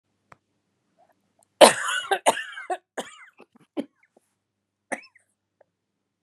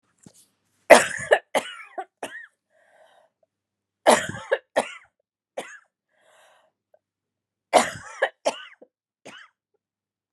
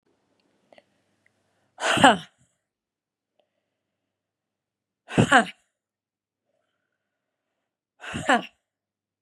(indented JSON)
{
  "cough_length": "6.2 s",
  "cough_amplitude": 32768,
  "cough_signal_mean_std_ratio": 0.21,
  "three_cough_length": "10.3 s",
  "three_cough_amplitude": 32767,
  "three_cough_signal_mean_std_ratio": 0.23,
  "exhalation_length": "9.2 s",
  "exhalation_amplitude": 30950,
  "exhalation_signal_mean_std_ratio": 0.21,
  "survey_phase": "beta (2021-08-13 to 2022-03-07)",
  "age": "45-64",
  "gender": "Female",
  "wearing_mask": "No",
  "symptom_cough_any": true,
  "symptom_fatigue": true,
  "symptom_headache": true,
  "symptom_change_to_sense_of_smell_or_taste": true,
  "symptom_loss_of_taste": true,
  "smoker_status": "Never smoked",
  "respiratory_condition_asthma": true,
  "respiratory_condition_other": false,
  "recruitment_source": "REACT",
  "submission_delay": "2 days",
  "covid_test_result": "Negative",
  "covid_test_method": "RT-qPCR"
}